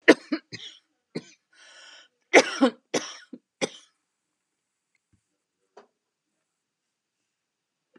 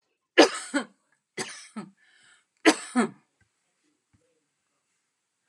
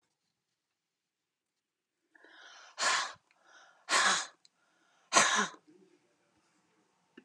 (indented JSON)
{
  "cough_length": "8.0 s",
  "cough_amplitude": 31528,
  "cough_signal_mean_std_ratio": 0.18,
  "three_cough_length": "5.5 s",
  "three_cough_amplitude": 26226,
  "three_cough_signal_mean_std_ratio": 0.23,
  "exhalation_length": "7.2 s",
  "exhalation_amplitude": 12251,
  "exhalation_signal_mean_std_ratio": 0.3,
  "survey_phase": "beta (2021-08-13 to 2022-03-07)",
  "age": "65+",
  "gender": "Female",
  "wearing_mask": "No",
  "symptom_runny_or_blocked_nose": true,
  "symptom_onset": "12 days",
  "smoker_status": "Never smoked",
  "respiratory_condition_asthma": false,
  "respiratory_condition_other": false,
  "recruitment_source": "REACT",
  "submission_delay": "2 days",
  "covid_test_result": "Negative",
  "covid_test_method": "RT-qPCR",
  "influenza_a_test_result": "Negative",
  "influenza_b_test_result": "Negative"
}